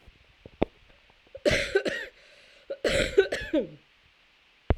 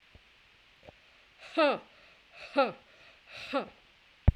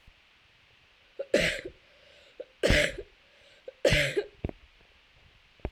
{"cough_length": "4.8 s", "cough_amplitude": 16201, "cough_signal_mean_std_ratio": 0.4, "exhalation_length": "4.4 s", "exhalation_amplitude": 14645, "exhalation_signal_mean_std_ratio": 0.3, "three_cough_length": "5.7 s", "three_cough_amplitude": 11012, "three_cough_signal_mean_std_ratio": 0.36, "survey_phase": "beta (2021-08-13 to 2022-03-07)", "age": "45-64", "gender": "Female", "wearing_mask": "No", "symptom_cough_any": true, "symptom_runny_or_blocked_nose": true, "symptom_sore_throat": true, "symptom_fatigue": true, "symptom_fever_high_temperature": true, "symptom_headache": true, "symptom_onset": "4 days", "smoker_status": "Never smoked", "respiratory_condition_asthma": true, "respiratory_condition_other": false, "recruitment_source": "Test and Trace", "submission_delay": "2 days", "covid_test_result": "Positive", "covid_test_method": "ePCR"}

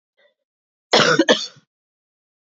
{"cough_length": "2.5 s", "cough_amplitude": 28939, "cough_signal_mean_std_ratio": 0.33, "survey_phase": "beta (2021-08-13 to 2022-03-07)", "age": "45-64", "gender": "Female", "wearing_mask": "No", "symptom_cough_any": true, "symptom_new_continuous_cough": true, "symptom_runny_or_blocked_nose": true, "symptom_shortness_of_breath": true, "symptom_sore_throat": true, "symptom_fatigue": true, "symptom_fever_high_temperature": true, "symptom_headache": true, "symptom_loss_of_taste": true, "symptom_other": true, "symptom_onset": "1 day", "smoker_status": "Never smoked", "respiratory_condition_asthma": false, "respiratory_condition_other": false, "recruitment_source": "Test and Trace", "submission_delay": "1 day", "covid_test_result": "Positive", "covid_test_method": "RT-qPCR", "covid_ct_value": 23.6, "covid_ct_gene": "ORF1ab gene"}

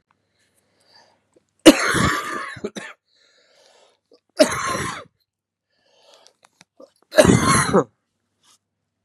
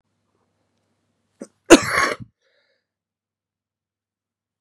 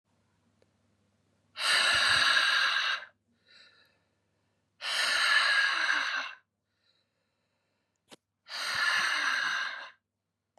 {"three_cough_length": "9.0 s", "three_cough_amplitude": 32768, "three_cough_signal_mean_std_ratio": 0.31, "cough_length": "4.6 s", "cough_amplitude": 32768, "cough_signal_mean_std_ratio": 0.17, "exhalation_length": "10.6 s", "exhalation_amplitude": 7645, "exhalation_signal_mean_std_ratio": 0.54, "survey_phase": "beta (2021-08-13 to 2022-03-07)", "age": "45-64", "gender": "Male", "wearing_mask": "No", "symptom_fatigue": true, "symptom_fever_high_temperature": true, "symptom_headache": true, "symptom_onset": "5 days", "smoker_status": "Ex-smoker", "respiratory_condition_asthma": false, "respiratory_condition_other": false, "recruitment_source": "Test and Trace", "submission_delay": "2 days", "covid_test_result": "Positive", "covid_test_method": "ePCR"}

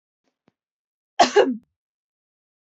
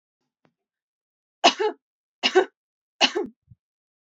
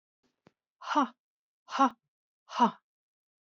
{"cough_length": "2.6 s", "cough_amplitude": 25471, "cough_signal_mean_std_ratio": 0.25, "three_cough_length": "4.2 s", "three_cough_amplitude": 26531, "three_cough_signal_mean_std_ratio": 0.27, "exhalation_length": "3.5 s", "exhalation_amplitude": 9243, "exhalation_signal_mean_std_ratio": 0.28, "survey_phase": "beta (2021-08-13 to 2022-03-07)", "age": "18-44", "gender": "Female", "wearing_mask": "No", "symptom_fatigue": true, "symptom_headache": true, "symptom_onset": "12 days", "smoker_status": "Never smoked", "respiratory_condition_asthma": false, "respiratory_condition_other": false, "recruitment_source": "REACT", "submission_delay": "0 days", "covid_test_result": "Negative", "covid_test_method": "RT-qPCR", "influenza_a_test_result": "Negative", "influenza_b_test_result": "Negative"}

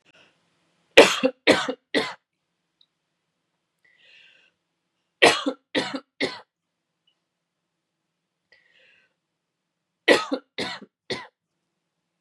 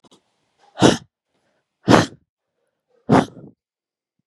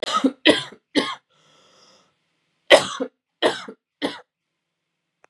{"three_cough_length": "12.2 s", "three_cough_amplitude": 32768, "three_cough_signal_mean_std_ratio": 0.23, "exhalation_length": "4.3 s", "exhalation_amplitude": 32768, "exhalation_signal_mean_std_ratio": 0.26, "cough_length": "5.3 s", "cough_amplitude": 32768, "cough_signal_mean_std_ratio": 0.3, "survey_phase": "beta (2021-08-13 to 2022-03-07)", "age": "18-44", "gender": "Male", "wearing_mask": "No", "symptom_cough_any": true, "symptom_runny_or_blocked_nose": true, "symptom_sore_throat": true, "symptom_fatigue": true, "symptom_headache": true, "smoker_status": "Never smoked", "respiratory_condition_asthma": false, "respiratory_condition_other": false, "recruitment_source": "Test and Trace", "submission_delay": "1 day", "covid_test_result": "Negative", "covid_test_method": "RT-qPCR"}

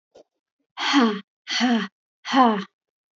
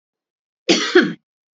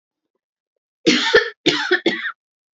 {"exhalation_length": "3.2 s", "exhalation_amplitude": 20179, "exhalation_signal_mean_std_ratio": 0.47, "cough_length": "1.5 s", "cough_amplitude": 28179, "cough_signal_mean_std_ratio": 0.37, "three_cough_length": "2.7 s", "three_cough_amplitude": 29944, "three_cough_signal_mean_std_ratio": 0.44, "survey_phase": "beta (2021-08-13 to 2022-03-07)", "age": "45-64", "gender": "Female", "wearing_mask": "No", "symptom_cough_any": true, "symptom_sore_throat": true, "symptom_fatigue": true, "smoker_status": "Never smoked", "respiratory_condition_asthma": false, "respiratory_condition_other": false, "recruitment_source": "REACT", "submission_delay": "2 days", "covid_test_result": "Negative", "covid_test_method": "RT-qPCR", "influenza_a_test_result": "Unknown/Void", "influenza_b_test_result": "Unknown/Void"}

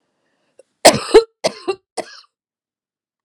{"cough_length": "3.2 s", "cough_amplitude": 32768, "cough_signal_mean_std_ratio": 0.24, "survey_phase": "alpha (2021-03-01 to 2021-08-12)", "age": "45-64", "gender": "Female", "wearing_mask": "No", "symptom_shortness_of_breath": true, "symptom_fatigue": true, "symptom_headache": true, "symptom_onset": "11 days", "smoker_status": "Never smoked", "respiratory_condition_asthma": false, "respiratory_condition_other": true, "recruitment_source": "REACT", "submission_delay": "2 days", "covid_test_result": "Negative", "covid_test_method": "RT-qPCR"}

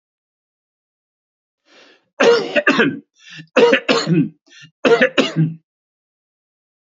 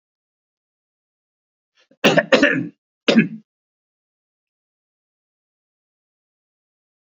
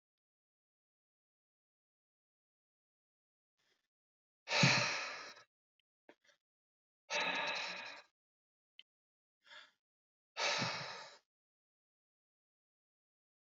{"three_cough_length": "7.0 s", "three_cough_amplitude": 31972, "three_cough_signal_mean_std_ratio": 0.41, "cough_length": "7.2 s", "cough_amplitude": 29354, "cough_signal_mean_std_ratio": 0.23, "exhalation_length": "13.5 s", "exhalation_amplitude": 4822, "exhalation_signal_mean_std_ratio": 0.28, "survey_phase": "beta (2021-08-13 to 2022-03-07)", "age": "65+", "gender": "Male", "wearing_mask": "No", "symptom_none": true, "smoker_status": "Never smoked", "respiratory_condition_asthma": false, "respiratory_condition_other": false, "recruitment_source": "REACT", "submission_delay": "1 day", "covid_test_result": "Negative", "covid_test_method": "RT-qPCR", "influenza_a_test_result": "Negative", "influenza_b_test_result": "Negative"}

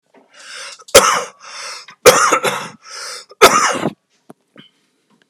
{"three_cough_length": "5.3 s", "three_cough_amplitude": 32768, "three_cough_signal_mean_std_ratio": 0.39, "survey_phase": "beta (2021-08-13 to 2022-03-07)", "age": "45-64", "gender": "Male", "wearing_mask": "No", "symptom_shortness_of_breath": true, "symptom_onset": "12 days", "smoker_status": "Never smoked", "respiratory_condition_asthma": true, "respiratory_condition_other": false, "recruitment_source": "REACT", "submission_delay": "1 day", "covid_test_result": "Positive", "covid_test_method": "RT-qPCR", "covid_ct_value": 21.0, "covid_ct_gene": "E gene", "influenza_a_test_result": "Negative", "influenza_b_test_result": "Negative"}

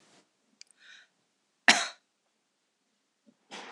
{"cough_length": "3.7 s", "cough_amplitude": 23211, "cough_signal_mean_std_ratio": 0.16, "survey_phase": "beta (2021-08-13 to 2022-03-07)", "age": "65+", "gender": "Female", "wearing_mask": "No", "symptom_none": true, "smoker_status": "Current smoker (11 or more cigarettes per day)", "respiratory_condition_asthma": false, "respiratory_condition_other": false, "recruitment_source": "REACT", "submission_delay": "2 days", "covid_test_result": "Negative", "covid_test_method": "RT-qPCR", "influenza_a_test_result": "Negative", "influenza_b_test_result": "Negative"}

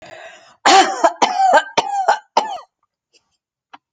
{"cough_length": "3.9 s", "cough_amplitude": 29169, "cough_signal_mean_std_ratio": 0.47, "survey_phase": "alpha (2021-03-01 to 2021-08-12)", "age": "45-64", "gender": "Female", "wearing_mask": "No", "symptom_none": true, "smoker_status": "Never smoked", "respiratory_condition_asthma": false, "respiratory_condition_other": false, "recruitment_source": "REACT", "submission_delay": "2 days", "covid_test_result": "Negative", "covid_test_method": "RT-qPCR"}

